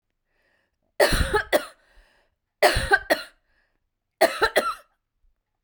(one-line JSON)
{"three_cough_length": "5.6 s", "three_cough_amplitude": 22928, "three_cough_signal_mean_std_ratio": 0.37, "survey_phase": "beta (2021-08-13 to 2022-03-07)", "age": "45-64", "gender": "Female", "wearing_mask": "No", "symptom_cough_any": true, "symptom_runny_or_blocked_nose": true, "symptom_fatigue": true, "symptom_fever_high_temperature": true, "symptom_headache": true, "symptom_onset": "2 days", "smoker_status": "Ex-smoker", "respiratory_condition_asthma": false, "respiratory_condition_other": false, "recruitment_source": "Test and Trace", "submission_delay": "2 days", "covid_test_result": "Positive", "covid_test_method": "RT-qPCR"}